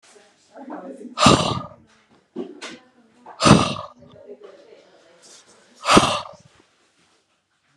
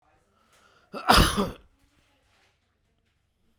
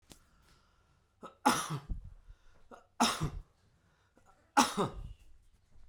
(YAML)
exhalation_length: 7.8 s
exhalation_amplitude: 32768
exhalation_signal_mean_std_ratio: 0.31
cough_length: 3.6 s
cough_amplitude: 22655
cough_signal_mean_std_ratio: 0.26
three_cough_length: 5.9 s
three_cough_amplitude: 8717
three_cough_signal_mean_std_ratio: 0.34
survey_phase: beta (2021-08-13 to 2022-03-07)
age: 45-64
gender: Male
wearing_mask: 'No'
symptom_none: true
smoker_status: Never smoked
respiratory_condition_asthma: false
respiratory_condition_other: false
recruitment_source: REACT
submission_delay: 1 day
covid_test_result: Negative
covid_test_method: RT-qPCR